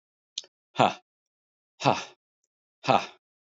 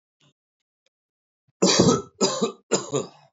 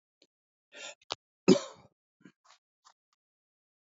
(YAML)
exhalation_length: 3.6 s
exhalation_amplitude: 18723
exhalation_signal_mean_std_ratio: 0.24
three_cough_length: 3.3 s
three_cough_amplitude: 20451
three_cough_signal_mean_std_ratio: 0.4
cough_length: 3.8 s
cough_amplitude: 12914
cough_signal_mean_std_ratio: 0.15
survey_phase: beta (2021-08-13 to 2022-03-07)
age: 65+
gender: Male
wearing_mask: 'No'
symptom_cough_any: true
symptom_runny_or_blocked_nose: true
symptom_shortness_of_breath: true
symptom_sore_throat: true
symptom_fatigue: true
smoker_status: Never smoked
respiratory_condition_asthma: false
respiratory_condition_other: false
recruitment_source: Test and Trace
submission_delay: 2 days
covid_test_result: Positive
covid_test_method: RT-qPCR
covid_ct_value: 24.7
covid_ct_gene: ORF1ab gene
covid_ct_mean: 25.0
covid_viral_load: 6300 copies/ml
covid_viral_load_category: Minimal viral load (< 10K copies/ml)